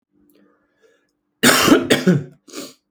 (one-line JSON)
{"cough_length": "2.9 s", "cough_amplitude": 32485, "cough_signal_mean_std_ratio": 0.4, "survey_phase": "alpha (2021-03-01 to 2021-08-12)", "age": "18-44", "gender": "Male", "wearing_mask": "No", "symptom_cough_any": true, "smoker_status": "Ex-smoker", "respiratory_condition_asthma": false, "respiratory_condition_other": false, "recruitment_source": "Test and Trace", "submission_delay": "7 days", "covid_test_result": "Positive", "covid_test_method": "RT-qPCR", "covid_ct_value": 37.3, "covid_ct_gene": "N gene"}